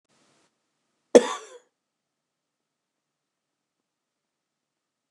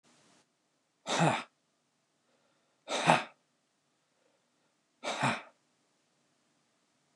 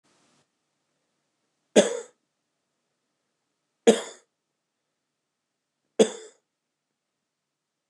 {"cough_length": "5.1 s", "cough_amplitude": 29201, "cough_signal_mean_std_ratio": 0.11, "exhalation_length": "7.2 s", "exhalation_amplitude": 14640, "exhalation_signal_mean_std_ratio": 0.28, "three_cough_length": "7.9 s", "three_cough_amplitude": 24287, "three_cough_signal_mean_std_ratio": 0.16, "survey_phase": "beta (2021-08-13 to 2022-03-07)", "age": "45-64", "gender": "Male", "wearing_mask": "No", "symptom_cough_any": true, "symptom_runny_or_blocked_nose": true, "symptom_onset": "6 days", "smoker_status": "Never smoked", "respiratory_condition_asthma": false, "respiratory_condition_other": false, "recruitment_source": "REACT", "submission_delay": "1 day", "covid_test_result": "Negative", "covid_test_method": "RT-qPCR", "influenza_a_test_result": "Unknown/Void", "influenza_b_test_result": "Unknown/Void"}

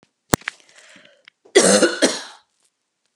{"cough_length": "3.2 s", "cough_amplitude": 32768, "cough_signal_mean_std_ratio": 0.33, "survey_phase": "beta (2021-08-13 to 2022-03-07)", "age": "45-64", "gender": "Female", "wearing_mask": "No", "symptom_cough_any": true, "symptom_runny_or_blocked_nose": true, "symptom_fatigue": true, "symptom_headache": true, "symptom_onset": "3 days", "smoker_status": "Ex-smoker", "respiratory_condition_asthma": false, "respiratory_condition_other": false, "recruitment_source": "REACT", "submission_delay": "1 day", "covid_test_result": "Negative", "covid_test_method": "RT-qPCR"}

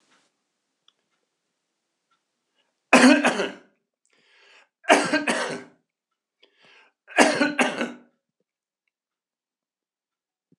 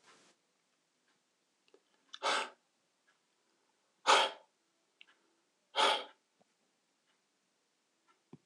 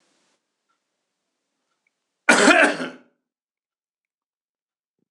{"three_cough_length": "10.6 s", "three_cough_amplitude": 26028, "three_cough_signal_mean_std_ratio": 0.28, "exhalation_length": "8.5 s", "exhalation_amplitude": 7200, "exhalation_signal_mean_std_ratio": 0.23, "cough_length": "5.1 s", "cough_amplitude": 26027, "cough_signal_mean_std_ratio": 0.24, "survey_phase": "beta (2021-08-13 to 2022-03-07)", "age": "65+", "gender": "Male", "wearing_mask": "No", "symptom_none": true, "smoker_status": "Never smoked", "respiratory_condition_asthma": false, "respiratory_condition_other": false, "recruitment_source": "REACT", "submission_delay": "6 days", "covid_test_result": "Negative", "covid_test_method": "RT-qPCR", "influenza_a_test_result": "Negative", "influenza_b_test_result": "Negative"}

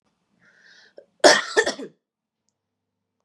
{"cough_length": "3.2 s", "cough_amplitude": 31117, "cough_signal_mean_std_ratio": 0.24, "survey_phase": "beta (2021-08-13 to 2022-03-07)", "age": "18-44", "gender": "Female", "wearing_mask": "No", "symptom_none": true, "smoker_status": "Never smoked", "respiratory_condition_asthma": true, "respiratory_condition_other": false, "recruitment_source": "REACT", "submission_delay": "1 day", "covid_test_result": "Negative", "covid_test_method": "RT-qPCR", "influenza_a_test_result": "Unknown/Void", "influenza_b_test_result": "Unknown/Void"}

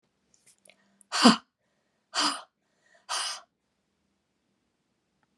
{"exhalation_length": "5.4 s", "exhalation_amplitude": 25563, "exhalation_signal_mean_std_ratio": 0.23, "survey_phase": "beta (2021-08-13 to 2022-03-07)", "age": "45-64", "gender": "Female", "wearing_mask": "No", "symptom_cough_any": true, "symptom_runny_or_blocked_nose": true, "symptom_fatigue": true, "symptom_fever_high_temperature": true, "symptom_headache": true, "symptom_onset": "3 days", "smoker_status": "Never smoked", "respiratory_condition_asthma": true, "respiratory_condition_other": false, "recruitment_source": "Test and Trace", "submission_delay": "1 day", "covid_test_result": "Positive", "covid_test_method": "ePCR"}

